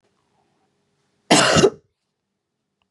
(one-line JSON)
{"cough_length": "2.9 s", "cough_amplitude": 28675, "cough_signal_mean_std_ratio": 0.3, "survey_phase": "beta (2021-08-13 to 2022-03-07)", "age": "45-64", "gender": "Female", "wearing_mask": "No", "symptom_cough_any": true, "symptom_new_continuous_cough": true, "symptom_runny_or_blocked_nose": true, "symptom_sore_throat": true, "symptom_fatigue": true, "symptom_fever_high_temperature": true, "symptom_headache": true, "symptom_onset": "2 days", "smoker_status": "Never smoked", "respiratory_condition_asthma": false, "respiratory_condition_other": false, "recruitment_source": "Test and Trace", "submission_delay": "1 day", "covid_test_result": "Positive", "covid_test_method": "RT-qPCR", "covid_ct_value": 27.5, "covid_ct_gene": "ORF1ab gene", "covid_ct_mean": 27.7, "covid_viral_load": "810 copies/ml", "covid_viral_load_category": "Minimal viral load (< 10K copies/ml)"}